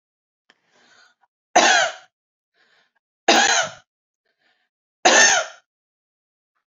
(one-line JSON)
{"three_cough_length": "6.7 s", "three_cough_amplitude": 29779, "three_cough_signal_mean_std_ratio": 0.33, "survey_phase": "beta (2021-08-13 to 2022-03-07)", "age": "45-64", "gender": "Female", "wearing_mask": "No", "symptom_fatigue": true, "symptom_onset": "13 days", "smoker_status": "Ex-smoker", "respiratory_condition_asthma": false, "respiratory_condition_other": false, "recruitment_source": "REACT", "submission_delay": "3 days", "covid_test_result": "Negative", "covid_test_method": "RT-qPCR"}